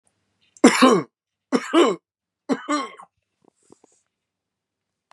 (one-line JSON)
{"three_cough_length": "5.1 s", "three_cough_amplitude": 30935, "three_cough_signal_mean_std_ratio": 0.32, "survey_phase": "beta (2021-08-13 to 2022-03-07)", "age": "45-64", "gender": "Male", "wearing_mask": "No", "symptom_none": true, "smoker_status": "Never smoked", "respiratory_condition_asthma": false, "respiratory_condition_other": false, "recruitment_source": "REACT", "submission_delay": "1 day", "covid_test_result": "Negative", "covid_test_method": "RT-qPCR", "influenza_a_test_result": "Unknown/Void", "influenza_b_test_result": "Unknown/Void"}